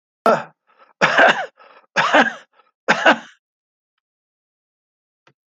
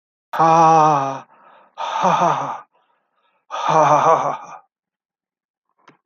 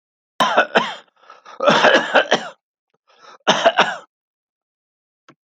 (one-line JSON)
{"three_cough_length": "5.5 s", "three_cough_amplitude": 29259, "three_cough_signal_mean_std_ratio": 0.35, "exhalation_length": "6.1 s", "exhalation_amplitude": 28752, "exhalation_signal_mean_std_ratio": 0.49, "cough_length": "5.5 s", "cough_amplitude": 32768, "cough_signal_mean_std_ratio": 0.41, "survey_phase": "alpha (2021-03-01 to 2021-08-12)", "age": "65+", "gender": "Male", "wearing_mask": "No", "symptom_fatigue": true, "smoker_status": "Never smoked", "respiratory_condition_asthma": false, "respiratory_condition_other": false, "recruitment_source": "REACT", "submission_delay": "2 days", "covid_test_result": "Negative", "covid_test_method": "RT-qPCR"}